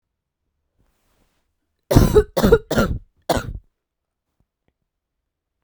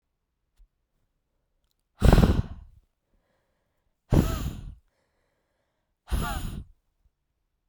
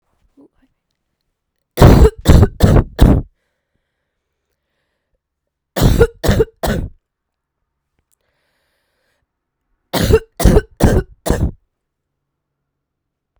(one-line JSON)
{"cough_length": "5.6 s", "cough_amplitude": 32768, "cough_signal_mean_std_ratio": 0.3, "exhalation_length": "7.7 s", "exhalation_amplitude": 20155, "exhalation_signal_mean_std_ratio": 0.27, "three_cough_length": "13.4 s", "three_cough_amplitude": 32768, "three_cough_signal_mean_std_ratio": 0.34, "survey_phase": "beta (2021-08-13 to 2022-03-07)", "age": "18-44", "gender": "Female", "wearing_mask": "No", "symptom_cough_any": true, "symptom_runny_or_blocked_nose": true, "symptom_shortness_of_breath": true, "symptom_sore_throat": true, "symptom_diarrhoea": true, "symptom_fatigue": true, "symptom_headache": true, "symptom_change_to_sense_of_smell_or_taste": true, "symptom_loss_of_taste": true, "symptom_onset": "2 days", "smoker_status": "Never smoked", "respiratory_condition_asthma": false, "respiratory_condition_other": false, "recruitment_source": "Test and Trace", "submission_delay": "1 day", "covid_test_result": "Positive", "covid_test_method": "RT-qPCR"}